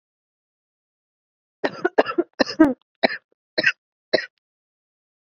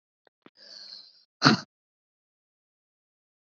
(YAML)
cough_length: 5.2 s
cough_amplitude: 27347
cough_signal_mean_std_ratio: 0.26
exhalation_length: 3.6 s
exhalation_amplitude: 28083
exhalation_signal_mean_std_ratio: 0.17
survey_phase: beta (2021-08-13 to 2022-03-07)
age: 18-44
gender: Female
wearing_mask: 'No'
symptom_runny_or_blocked_nose: true
symptom_sore_throat: true
symptom_diarrhoea: true
symptom_headache: true
symptom_other: true
symptom_onset: 5 days
smoker_status: Ex-smoker
respiratory_condition_asthma: true
respiratory_condition_other: false
recruitment_source: Test and Trace
submission_delay: 2 days
covid_test_result: Positive
covid_test_method: ePCR